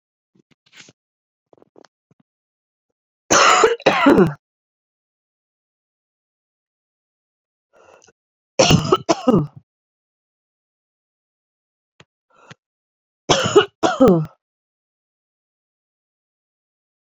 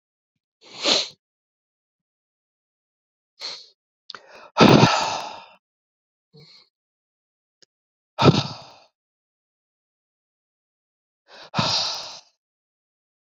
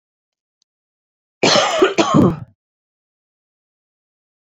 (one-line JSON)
{"three_cough_length": "17.2 s", "three_cough_amplitude": 32767, "three_cough_signal_mean_std_ratio": 0.28, "exhalation_length": "13.2 s", "exhalation_amplitude": 32768, "exhalation_signal_mean_std_ratio": 0.25, "cough_length": "4.5 s", "cough_amplitude": 28951, "cough_signal_mean_std_ratio": 0.35, "survey_phase": "beta (2021-08-13 to 2022-03-07)", "age": "45-64", "gender": "Female", "wearing_mask": "No", "symptom_cough_any": true, "symptom_runny_or_blocked_nose": true, "symptom_sore_throat": true, "symptom_abdominal_pain": true, "symptom_diarrhoea": true, "symptom_fatigue": true, "symptom_fever_high_temperature": true, "symptom_headache": true, "symptom_change_to_sense_of_smell_or_taste": true, "symptom_loss_of_taste": true, "smoker_status": "Never smoked", "respiratory_condition_asthma": false, "respiratory_condition_other": false, "recruitment_source": "Test and Trace", "submission_delay": "2 days", "covid_test_result": "Positive", "covid_test_method": "LFT"}